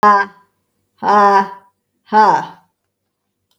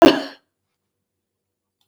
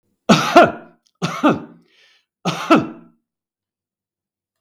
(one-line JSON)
{"exhalation_length": "3.6 s", "exhalation_amplitude": 32551, "exhalation_signal_mean_std_ratio": 0.46, "cough_length": "1.9 s", "cough_amplitude": 32768, "cough_signal_mean_std_ratio": 0.22, "three_cough_length": "4.6 s", "three_cough_amplitude": 32768, "three_cough_signal_mean_std_ratio": 0.34, "survey_phase": "beta (2021-08-13 to 2022-03-07)", "age": "65+", "gender": "Female", "wearing_mask": "No", "symptom_none": true, "smoker_status": "Never smoked", "respiratory_condition_asthma": false, "respiratory_condition_other": false, "recruitment_source": "REACT", "submission_delay": "2 days", "covid_test_result": "Negative", "covid_test_method": "RT-qPCR", "influenza_a_test_result": "Negative", "influenza_b_test_result": "Negative"}